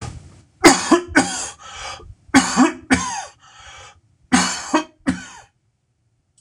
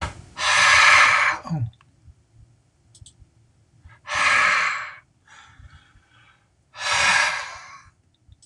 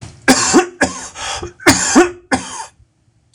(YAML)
three_cough_length: 6.4 s
three_cough_amplitude: 26028
three_cough_signal_mean_std_ratio: 0.41
exhalation_length: 8.5 s
exhalation_amplitude: 25936
exhalation_signal_mean_std_ratio: 0.47
cough_length: 3.3 s
cough_amplitude: 26028
cough_signal_mean_std_ratio: 0.51
survey_phase: beta (2021-08-13 to 2022-03-07)
age: 45-64
gender: Male
wearing_mask: 'No'
symptom_none: true
smoker_status: Never smoked
respiratory_condition_asthma: false
respiratory_condition_other: false
recruitment_source: REACT
submission_delay: 1 day
covid_test_result: Negative
covid_test_method: RT-qPCR